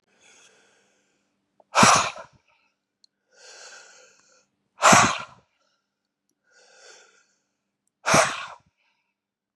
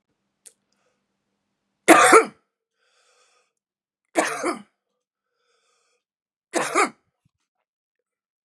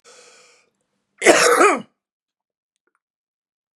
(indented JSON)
{
  "exhalation_length": "9.6 s",
  "exhalation_amplitude": 29690,
  "exhalation_signal_mean_std_ratio": 0.25,
  "three_cough_length": "8.4 s",
  "three_cough_amplitude": 32743,
  "three_cough_signal_mean_std_ratio": 0.23,
  "cough_length": "3.8 s",
  "cough_amplitude": 32768,
  "cough_signal_mean_std_ratio": 0.3,
  "survey_phase": "beta (2021-08-13 to 2022-03-07)",
  "age": "45-64",
  "gender": "Male",
  "wearing_mask": "No",
  "symptom_cough_any": true,
  "symptom_runny_or_blocked_nose": true,
  "smoker_status": "Never smoked",
  "respiratory_condition_asthma": false,
  "respiratory_condition_other": false,
  "recruitment_source": "Test and Trace",
  "submission_delay": "1 day",
  "covid_test_result": "Positive",
  "covid_test_method": "LFT"
}